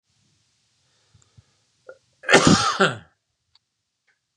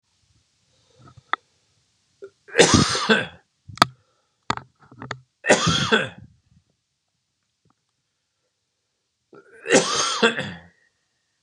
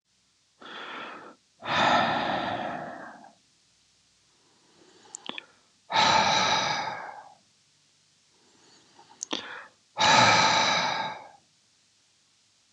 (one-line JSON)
{"cough_length": "4.4 s", "cough_amplitude": 32768, "cough_signal_mean_std_ratio": 0.28, "three_cough_length": "11.4 s", "three_cough_amplitude": 32768, "three_cough_signal_mean_std_ratio": 0.32, "exhalation_length": "12.7 s", "exhalation_amplitude": 14983, "exhalation_signal_mean_std_ratio": 0.45, "survey_phase": "beta (2021-08-13 to 2022-03-07)", "age": "45-64", "gender": "Male", "wearing_mask": "No", "symptom_none": true, "smoker_status": "Ex-smoker", "respiratory_condition_asthma": true, "respiratory_condition_other": false, "recruitment_source": "REACT", "submission_delay": "2 days", "covid_test_result": "Negative", "covid_test_method": "RT-qPCR", "influenza_a_test_result": "Negative", "influenza_b_test_result": "Negative"}